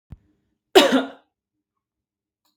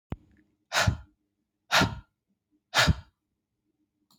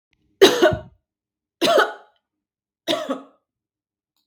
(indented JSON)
{
  "cough_length": "2.6 s",
  "cough_amplitude": 32766,
  "cough_signal_mean_std_ratio": 0.25,
  "exhalation_length": "4.2 s",
  "exhalation_amplitude": 14308,
  "exhalation_signal_mean_std_ratio": 0.31,
  "three_cough_length": "4.3 s",
  "three_cough_amplitude": 32768,
  "three_cough_signal_mean_std_ratio": 0.33,
  "survey_phase": "beta (2021-08-13 to 2022-03-07)",
  "age": "18-44",
  "gender": "Female",
  "wearing_mask": "No",
  "symptom_none": true,
  "smoker_status": "Never smoked",
  "respiratory_condition_asthma": false,
  "respiratory_condition_other": false,
  "recruitment_source": "REACT",
  "submission_delay": "3 days",
  "covid_test_result": "Negative",
  "covid_test_method": "RT-qPCR",
  "influenza_a_test_result": "Negative",
  "influenza_b_test_result": "Negative"
}